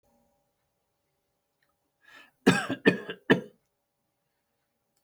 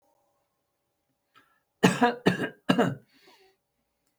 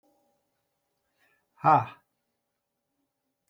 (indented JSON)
{
  "cough_length": "5.0 s",
  "cough_amplitude": 17156,
  "cough_signal_mean_std_ratio": 0.22,
  "three_cough_length": "4.2 s",
  "three_cough_amplitude": 21469,
  "three_cough_signal_mean_std_ratio": 0.3,
  "exhalation_length": "3.5 s",
  "exhalation_amplitude": 12045,
  "exhalation_signal_mean_std_ratio": 0.19,
  "survey_phase": "beta (2021-08-13 to 2022-03-07)",
  "age": "65+",
  "gender": "Male",
  "wearing_mask": "No",
  "symptom_none": true,
  "smoker_status": "Ex-smoker",
  "respiratory_condition_asthma": false,
  "respiratory_condition_other": false,
  "recruitment_source": "REACT",
  "submission_delay": "7 days",
  "covid_test_result": "Negative",
  "covid_test_method": "RT-qPCR",
  "influenza_a_test_result": "Negative",
  "influenza_b_test_result": "Negative"
}